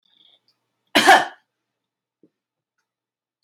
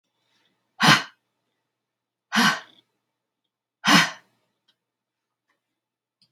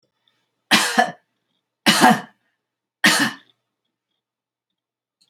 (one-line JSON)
{"cough_length": "3.4 s", "cough_amplitude": 29655, "cough_signal_mean_std_ratio": 0.22, "exhalation_length": "6.3 s", "exhalation_amplitude": 28333, "exhalation_signal_mean_std_ratio": 0.25, "three_cough_length": "5.3 s", "three_cough_amplitude": 29519, "three_cough_signal_mean_std_ratio": 0.32, "survey_phase": "beta (2021-08-13 to 2022-03-07)", "age": "45-64", "gender": "Female", "wearing_mask": "No", "symptom_none": true, "smoker_status": "Ex-smoker", "respiratory_condition_asthma": false, "respiratory_condition_other": false, "recruitment_source": "REACT", "submission_delay": "5 days", "covid_test_result": "Negative", "covid_test_method": "RT-qPCR"}